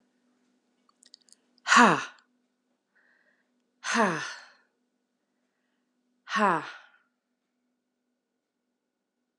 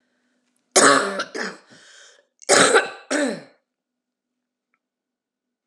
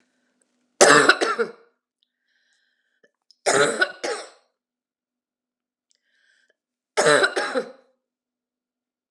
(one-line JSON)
{"exhalation_length": "9.4 s", "exhalation_amplitude": 18719, "exhalation_signal_mean_std_ratio": 0.24, "cough_length": "5.7 s", "cough_amplitude": 32768, "cough_signal_mean_std_ratio": 0.34, "three_cough_length": "9.1 s", "three_cough_amplitude": 32203, "three_cough_signal_mean_std_ratio": 0.31, "survey_phase": "alpha (2021-03-01 to 2021-08-12)", "age": "45-64", "gender": "Female", "wearing_mask": "No", "symptom_cough_any": true, "symptom_fatigue": true, "symptom_headache": true, "symptom_change_to_sense_of_smell_or_taste": true, "symptom_onset": "7 days", "smoker_status": "Never smoked", "respiratory_condition_asthma": false, "respiratory_condition_other": false, "recruitment_source": "Test and Trace", "submission_delay": "2 days", "covid_test_result": "Positive", "covid_test_method": "RT-qPCR", "covid_ct_value": 14.9, "covid_ct_gene": "ORF1ab gene", "covid_ct_mean": 15.1, "covid_viral_load": "11000000 copies/ml", "covid_viral_load_category": "High viral load (>1M copies/ml)"}